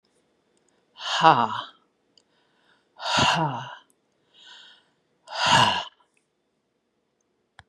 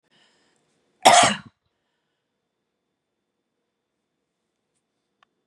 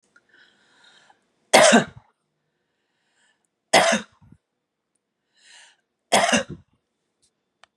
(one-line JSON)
{"exhalation_length": "7.7 s", "exhalation_amplitude": 26586, "exhalation_signal_mean_std_ratio": 0.33, "cough_length": "5.5 s", "cough_amplitude": 32768, "cough_signal_mean_std_ratio": 0.18, "three_cough_length": "7.8 s", "three_cough_amplitude": 30110, "three_cough_signal_mean_std_ratio": 0.26, "survey_phase": "beta (2021-08-13 to 2022-03-07)", "age": "65+", "gender": "Female", "wearing_mask": "No", "symptom_none": true, "smoker_status": "Ex-smoker", "respiratory_condition_asthma": false, "respiratory_condition_other": false, "recruitment_source": "REACT", "submission_delay": "0 days", "covid_test_result": "Negative", "covid_test_method": "RT-qPCR"}